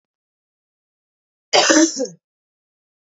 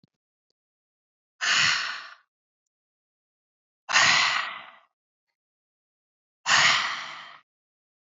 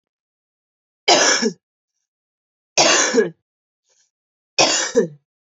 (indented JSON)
{
  "cough_length": "3.1 s",
  "cough_amplitude": 29497,
  "cough_signal_mean_std_ratio": 0.31,
  "exhalation_length": "8.0 s",
  "exhalation_amplitude": 15842,
  "exhalation_signal_mean_std_ratio": 0.37,
  "three_cough_length": "5.5 s",
  "three_cough_amplitude": 32291,
  "three_cough_signal_mean_std_ratio": 0.4,
  "survey_phase": "beta (2021-08-13 to 2022-03-07)",
  "age": "18-44",
  "gender": "Female",
  "wearing_mask": "No",
  "symptom_cough_any": true,
  "symptom_runny_or_blocked_nose": true,
  "symptom_sore_throat": true,
  "symptom_fatigue": true,
  "smoker_status": "Never smoked",
  "respiratory_condition_asthma": false,
  "respiratory_condition_other": false,
  "recruitment_source": "Test and Trace",
  "submission_delay": "2 days",
  "covid_test_result": "Positive",
  "covid_test_method": "RT-qPCR",
  "covid_ct_value": 18.3,
  "covid_ct_gene": "N gene"
}